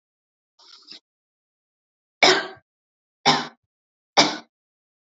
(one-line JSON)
{"three_cough_length": "5.1 s", "three_cough_amplitude": 29395, "three_cough_signal_mean_std_ratio": 0.25, "survey_phase": "beta (2021-08-13 to 2022-03-07)", "age": "18-44", "gender": "Female", "wearing_mask": "No", "symptom_none": true, "smoker_status": "Never smoked", "respiratory_condition_asthma": false, "respiratory_condition_other": false, "recruitment_source": "REACT", "submission_delay": "1 day", "covid_test_result": "Negative", "covid_test_method": "RT-qPCR"}